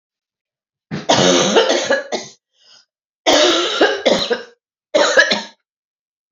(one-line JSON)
{"cough_length": "6.3 s", "cough_amplitude": 31586, "cough_signal_mean_std_ratio": 0.54, "survey_phase": "beta (2021-08-13 to 2022-03-07)", "age": "45-64", "gender": "Female", "wearing_mask": "No", "symptom_cough_any": true, "symptom_new_continuous_cough": true, "symptom_runny_or_blocked_nose": true, "symptom_sore_throat": true, "symptom_fatigue": true, "symptom_fever_high_temperature": true, "symptom_headache": true, "symptom_onset": "3 days", "smoker_status": "Never smoked", "respiratory_condition_asthma": false, "respiratory_condition_other": false, "recruitment_source": "Test and Trace", "submission_delay": "2 days", "covid_test_result": "Positive", "covid_test_method": "RT-qPCR", "covid_ct_value": 32.1, "covid_ct_gene": "ORF1ab gene"}